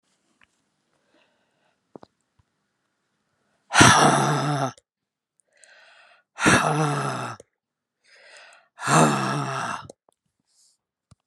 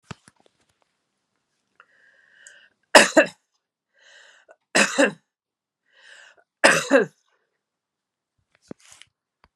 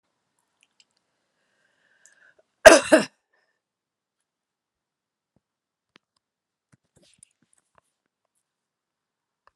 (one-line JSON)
{"exhalation_length": "11.3 s", "exhalation_amplitude": 32767, "exhalation_signal_mean_std_ratio": 0.37, "three_cough_length": "9.6 s", "three_cough_amplitude": 32768, "three_cough_signal_mean_std_ratio": 0.22, "cough_length": "9.6 s", "cough_amplitude": 32768, "cough_signal_mean_std_ratio": 0.12, "survey_phase": "alpha (2021-03-01 to 2021-08-12)", "age": "65+", "gender": "Female", "wearing_mask": "No", "symptom_cough_any": true, "symptom_shortness_of_breath": true, "symptom_fatigue": true, "symptom_headache": true, "smoker_status": "Never smoked", "respiratory_condition_asthma": false, "respiratory_condition_other": false, "recruitment_source": "Test and Trace", "submission_delay": "2 days", "covid_test_result": "Positive", "covid_test_method": "RT-qPCR"}